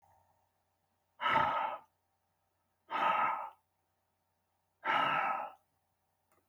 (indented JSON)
{
  "exhalation_length": "6.5 s",
  "exhalation_amplitude": 4373,
  "exhalation_signal_mean_std_ratio": 0.43,
  "survey_phase": "beta (2021-08-13 to 2022-03-07)",
  "age": "45-64",
  "gender": "Male",
  "wearing_mask": "No",
  "symptom_shortness_of_breath": true,
  "symptom_fatigue": true,
  "symptom_onset": "12 days",
  "smoker_status": "Ex-smoker",
  "respiratory_condition_asthma": false,
  "respiratory_condition_other": false,
  "recruitment_source": "REACT",
  "submission_delay": "0 days",
  "covid_test_result": "Negative",
  "covid_test_method": "RT-qPCR",
  "influenza_a_test_result": "Negative",
  "influenza_b_test_result": "Negative"
}